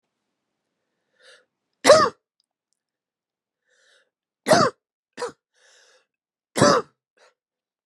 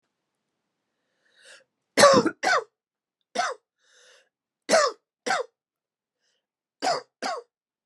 {"three_cough_length": "7.9 s", "three_cough_amplitude": 31525, "three_cough_signal_mean_std_ratio": 0.24, "cough_length": "7.9 s", "cough_amplitude": 23934, "cough_signal_mean_std_ratio": 0.3, "survey_phase": "beta (2021-08-13 to 2022-03-07)", "age": "45-64", "gender": "Female", "wearing_mask": "No", "symptom_cough_any": true, "symptom_new_continuous_cough": true, "symptom_runny_or_blocked_nose": true, "symptom_fatigue": true, "symptom_fever_high_temperature": true, "symptom_headache": true, "symptom_change_to_sense_of_smell_or_taste": true, "symptom_loss_of_taste": true, "symptom_onset": "2 days", "smoker_status": "Never smoked", "respiratory_condition_asthma": false, "respiratory_condition_other": false, "recruitment_source": "Test and Trace", "submission_delay": "1 day", "covid_test_result": "Positive", "covid_test_method": "RT-qPCR", "covid_ct_value": 20.2, "covid_ct_gene": "ORF1ab gene", "covid_ct_mean": 21.1, "covid_viral_load": "120000 copies/ml", "covid_viral_load_category": "Low viral load (10K-1M copies/ml)"}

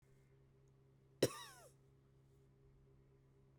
{"cough_length": "3.6 s", "cough_amplitude": 3225, "cough_signal_mean_std_ratio": 0.21, "survey_phase": "beta (2021-08-13 to 2022-03-07)", "age": "45-64", "gender": "Female", "wearing_mask": "No", "symptom_cough_any": true, "symptom_runny_or_blocked_nose": true, "symptom_shortness_of_breath": true, "symptom_sore_throat": true, "symptom_headache": true, "symptom_other": true, "symptom_onset": "4 days", "smoker_status": "Never smoked", "respiratory_condition_asthma": false, "respiratory_condition_other": false, "recruitment_source": "Test and Trace", "submission_delay": "1 day", "covid_test_result": "Positive", "covid_test_method": "RT-qPCR", "covid_ct_value": 20.2, "covid_ct_gene": "ORF1ab gene", "covid_ct_mean": 20.6, "covid_viral_load": "170000 copies/ml", "covid_viral_load_category": "Low viral load (10K-1M copies/ml)"}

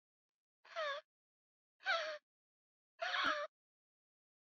{"exhalation_length": "4.5 s", "exhalation_amplitude": 1943, "exhalation_signal_mean_std_ratio": 0.39, "survey_phase": "beta (2021-08-13 to 2022-03-07)", "age": "18-44", "gender": "Female", "wearing_mask": "No", "symptom_cough_any": true, "symptom_new_continuous_cough": true, "symptom_sore_throat": true, "smoker_status": "Never smoked", "respiratory_condition_asthma": false, "respiratory_condition_other": false, "recruitment_source": "Test and Trace", "submission_delay": "2 days", "covid_test_result": "Positive", "covid_test_method": "LFT"}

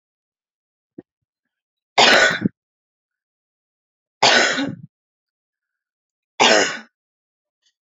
{"three_cough_length": "7.9 s", "three_cough_amplitude": 32403, "three_cough_signal_mean_std_ratio": 0.31, "survey_phase": "alpha (2021-03-01 to 2021-08-12)", "age": "18-44", "gender": "Female", "wearing_mask": "No", "symptom_none": true, "smoker_status": "Never smoked", "respiratory_condition_asthma": false, "respiratory_condition_other": false, "recruitment_source": "REACT", "submission_delay": "1 day", "covid_test_result": "Negative", "covid_test_method": "RT-qPCR"}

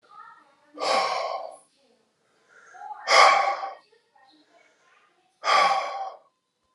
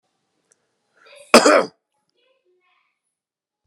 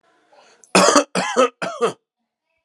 {"exhalation_length": "6.7 s", "exhalation_amplitude": 23151, "exhalation_signal_mean_std_ratio": 0.4, "cough_length": "3.7 s", "cough_amplitude": 32768, "cough_signal_mean_std_ratio": 0.21, "three_cough_length": "2.6 s", "three_cough_amplitude": 32767, "three_cough_signal_mean_std_ratio": 0.42, "survey_phase": "alpha (2021-03-01 to 2021-08-12)", "age": "45-64", "gender": "Male", "wearing_mask": "Yes", "symptom_cough_any": true, "symptom_fatigue": true, "symptom_fever_high_temperature": true, "symptom_headache": true, "symptom_change_to_sense_of_smell_or_taste": true, "symptom_onset": "12 days", "smoker_status": "Never smoked", "respiratory_condition_asthma": false, "respiratory_condition_other": false, "recruitment_source": "Test and Trace", "submission_delay": "2 days", "covid_test_result": "Positive", "covid_test_method": "RT-qPCR", "covid_ct_value": 11.4, "covid_ct_gene": "N gene", "covid_ct_mean": 11.5, "covid_viral_load": "170000000 copies/ml", "covid_viral_load_category": "High viral load (>1M copies/ml)"}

